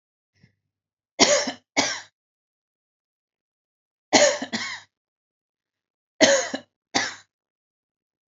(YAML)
three_cough_length: 8.3 s
three_cough_amplitude: 27639
three_cough_signal_mean_std_ratio: 0.3
survey_phase: alpha (2021-03-01 to 2021-08-12)
age: 18-44
gender: Female
wearing_mask: 'No'
symptom_none: true
smoker_status: Ex-smoker
respiratory_condition_asthma: false
respiratory_condition_other: false
recruitment_source: REACT
submission_delay: 3 days
covid_test_result: Negative
covid_test_method: RT-qPCR